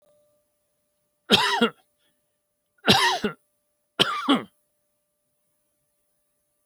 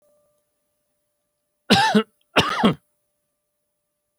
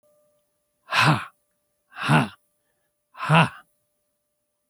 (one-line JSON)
{"three_cough_length": "6.7 s", "three_cough_amplitude": 25787, "three_cough_signal_mean_std_ratio": 0.31, "cough_length": "4.2 s", "cough_amplitude": 31395, "cough_signal_mean_std_ratio": 0.31, "exhalation_length": "4.7 s", "exhalation_amplitude": 27077, "exhalation_signal_mean_std_ratio": 0.32, "survey_phase": "beta (2021-08-13 to 2022-03-07)", "age": "65+", "gender": "Male", "wearing_mask": "No", "symptom_none": true, "smoker_status": "Ex-smoker", "respiratory_condition_asthma": false, "respiratory_condition_other": false, "recruitment_source": "REACT", "submission_delay": "1 day", "covid_test_result": "Negative", "covid_test_method": "RT-qPCR"}